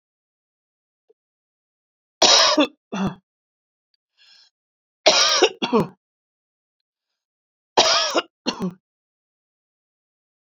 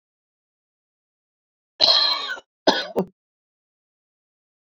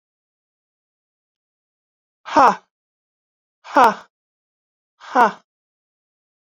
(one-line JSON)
{"three_cough_length": "10.6 s", "three_cough_amplitude": 29576, "three_cough_signal_mean_std_ratio": 0.32, "cough_length": "4.8 s", "cough_amplitude": 27204, "cough_signal_mean_std_ratio": 0.29, "exhalation_length": "6.5 s", "exhalation_amplitude": 28836, "exhalation_signal_mean_std_ratio": 0.22, "survey_phase": "beta (2021-08-13 to 2022-03-07)", "age": "45-64", "gender": "Female", "wearing_mask": "No", "symptom_none": true, "smoker_status": "Never smoked", "respiratory_condition_asthma": true, "respiratory_condition_other": false, "recruitment_source": "REACT", "submission_delay": "11 days", "covid_test_result": "Negative", "covid_test_method": "RT-qPCR", "influenza_a_test_result": "Unknown/Void", "influenza_b_test_result": "Unknown/Void"}